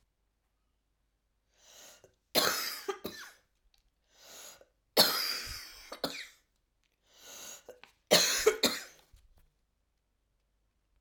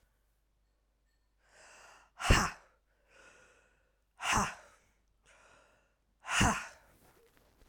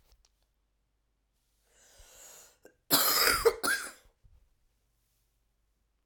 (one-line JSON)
{"three_cough_length": "11.0 s", "three_cough_amplitude": 10721, "three_cough_signal_mean_std_ratio": 0.31, "exhalation_length": "7.7 s", "exhalation_amplitude": 10289, "exhalation_signal_mean_std_ratio": 0.28, "cough_length": "6.1 s", "cough_amplitude": 11462, "cough_signal_mean_std_ratio": 0.3, "survey_phase": "alpha (2021-03-01 to 2021-08-12)", "age": "45-64", "gender": "Female", "wearing_mask": "No", "symptom_cough_any": true, "symptom_shortness_of_breath": true, "symptom_change_to_sense_of_smell_or_taste": true, "symptom_onset": "4 days", "smoker_status": "Ex-smoker", "respiratory_condition_asthma": false, "respiratory_condition_other": false, "recruitment_source": "Test and Trace", "submission_delay": "2 days", "covid_test_result": "Positive", "covid_test_method": "RT-qPCR"}